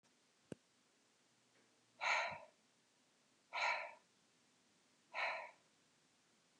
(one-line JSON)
{"exhalation_length": "6.6 s", "exhalation_amplitude": 1817, "exhalation_signal_mean_std_ratio": 0.34, "survey_phase": "beta (2021-08-13 to 2022-03-07)", "age": "45-64", "gender": "Female", "wearing_mask": "No", "symptom_runny_or_blocked_nose": true, "smoker_status": "Never smoked", "respiratory_condition_asthma": false, "respiratory_condition_other": false, "recruitment_source": "REACT", "submission_delay": "1 day", "covid_test_result": "Negative", "covid_test_method": "RT-qPCR", "influenza_a_test_result": "Unknown/Void", "influenza_b_test_result": "Unknown/Void"}